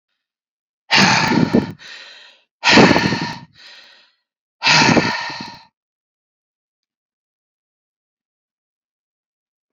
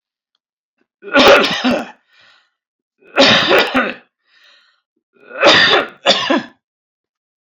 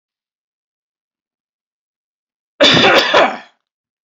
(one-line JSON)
{"exhalation_length": "9.7 s", "exhalation_amplitude": 30906, "exhalation_signal_mean_std_ratio": 0.36, "three_cough_length": "7.4 s", "three_cough_amplitude": 32269, "three_cough_signal_mean_std_ratio": 0.45, "cough_length": "4.2 s", "cough_amplitude": 30653, "cough_signal_mean_std_ratio": 0.34, "survey_phase": "beta (2021-08-13 to 2022-03-07)", "age": "65+", "gender": "Male", "wearing_mask": "No", "symptom_none": true, "smoker_status": "Ex-smoker", "respiratory_condition_asthma": false, "respiratory_condition_other": false, "recruitment_source": "REACT", "submission_delay": "1 day", "covid_test_result": "Negative", "covid_test_method": "RT-qPCR"}